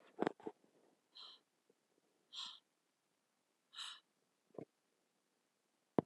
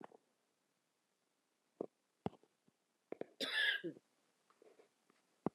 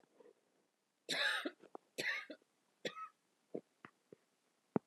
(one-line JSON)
{"exhalation_length": "6.1 s", "exhalation_amplitude": 4864, "exhalation_signal_mean_std_ratio": 0.18, "cough_length": "5.5 s", "cough_amplitude": 2543, "cough_signal_mean_std_ratio": 0.26, "three_cough_length": "4.9 s", "three_cough_amplitude": 3264, "three_cough_signal_mean_std_ratio": 0.34, "survey_phase": "beta (2021-08-13 to 2022-03-07)", "age": "45-64", "gender": "Female", "wearing_mask": "No", "symptom_cough_any": true, "symptom_new_continuous_cough": true, "symptom_shortness_of_breath": true, "symptom_sore_throat": true, "symptom_fatigue": true, "symptom_fever_high_temperature": true, "symptom_change_to_sense_of_smell_or_taste": true, "symptom_loss_of_taste": true, "symptom_onset": "4 days", "smoker_status": "Ex-smoker", "respiratory_condition_asthma": false, "respiratory_condition_other": false, "recruitment_source": "Test and Trace", "submission_delay": "1 day", "covid_test_result": "Positive", "covid_test_method": "ePCR"}